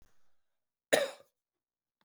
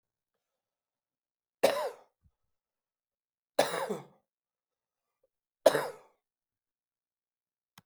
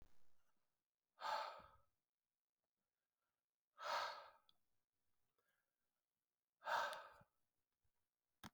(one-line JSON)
{"cough_length": "2.0 s", "cough_amplitude": 10250, "cough_signal_mean_std_ratio": 0.22, "three_cough_length": "7.9 s", "three_cough_amplitude": 15900, "three_cough_signal_mean_std_ratio": 0.2, "exhalation_length": "8.5 s", "exhalation_amplitude": 1018, "exhalation_signal_mean_std_ratio": 0.32, "survey_phase": "beta (2021-08-13 to 2022-03-07)", "age": "45-64", "gender": "Male", "wearing_mask": "No", "symptom_cough_any": true, "symptom_runny_or_blocked_nose": true, "symptom_sore_throat": true, "symptom_fatigue": true, "symptom_headache": true, "smoker_status": "Never smoked", "respiratory_condition_asthma": false, "respiratory_condition_other": false, "recruitment_source": "Test and Trace", "submission_delay": "2 days", "covid_test_result": "Positive", "covid_test_method": "RT-qPCR", "covid_ct_value": 11.3, "covid_ct_gene": "ORF1ab gene"}